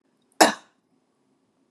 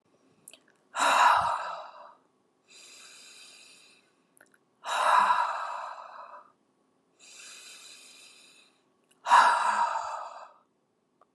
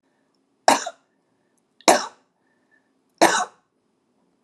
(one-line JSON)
{"cough_length": "1.7 s", "cough_amplitude": 32525, "cough_signal_mean_std_ratio": 0.19, "exhalation_length": "11.3 s", "exhalation_amplitude": 12948, "exhalation_signal_mean_std_ratio": 0.4, "three_cough_length": "4.4 s", "three_cough_amplitude": 32768, "three_cough_signal_mean_std_ratio": 0.25, "survey_phase": "alpha (2021-03-01 to 2021-08-12)", "age": "45-64", "gender": "Female", "wearing_mask": "No", "symptom_none": true, "smoker_status": "Never smoked", "respiratory_condition_asthma": false, "respiratory_condition_other": false, "recruitment_source": "REACT", "submission_delay": "2 days", "covid_test_result": "Negative", "covid_test_method": "RT-qPCR"}